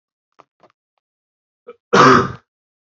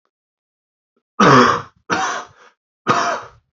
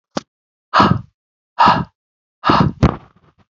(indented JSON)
{
  "cough_length": "2.9 s",
  "cough_amplitude": 29779,
  "cough_signal_mean_std_ratio": 0.28,
  "three_cough_length": "3.6 s",
  "three_cough_amplitude": 28304,
  "three_cough_signal_mean_std_ratio": 0.41,
  "exhalation_length": "3.6 s",
  "exhalation_amplitude": 32768,
  "exhalation_signal_mean_std_ratio": 0.39,
  "survey_phase": "beta (2021-08-13 to 2022-03-07)",
  "age": "18-44",
  "gender": "Male",
  "wearing_mask": "No",
  "symptom_headache": true,
  "smoker_status": "Ex-smoker",
  "respiratory_condition_asthma": false,
  "respiratory_condition_other": false,
  "recruitment_source": "Test and Trace",
  "submission_delay": "2 days",
  "covid_test_result": "Positive",
  "covid_test_method": "ePCR"
}